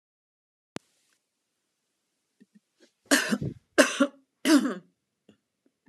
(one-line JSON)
{"three_cough_length": "5.9 s", "three_cough_amplitude": 25630, "three_cough_signal_mean_std_ratio": 0.28, "survey_phase": "beta (2021-08-13 to 2022-03-07)", "age": "45-64", "gender": "Female", "wearing_mask": "No", "symptom_cough_any": true, "smoker_status": "Never smoked", "respiratory_condition_asthma": false, "respiratory_condition_other": false, "recruitment_source": "REACT", "submission_delay": "2 days", "covid_test_result": "Negative", "covid_test_method": "RT-qPCR"}